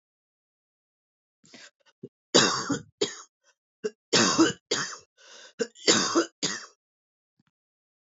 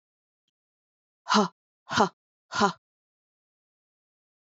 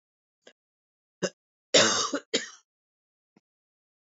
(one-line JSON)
{"three_cough_length": "8.0 s", "three_cough_amplitude": 22169, "three_cough_signal_mean_std_ratio": 0.35, "exhalation_length": "4.4 s", "exhalation_amplitude": 15264, "exhalation_signal_mean_std_ratio": 0.25, "cough_length": "4.2 s", "cough_amplitude": 16658, "cough_signal_mean_std_ratio": 0.26, "survey_phase": "beta (2021-08-13 to 2022-03-07)", "age": "45-64", "gender": "Female", "wearing_mask": "No", "symptom_cough_any": true, "symptom_runny_or_blocked_nose": true, "symptom_sore_throat": true, "smoker_status": "Never smoked", "respiratory_condition_asthma": false, "respiratory_condition_other": false, "recruitment_source": "Test and Trace", "submission_delay": "2 days", "covid_test_result": "Positive", "covid_test_method": "RT-qPCR", "covid_ct_value": 18.4, "covid_ct_gene": "ORF1ab gene"}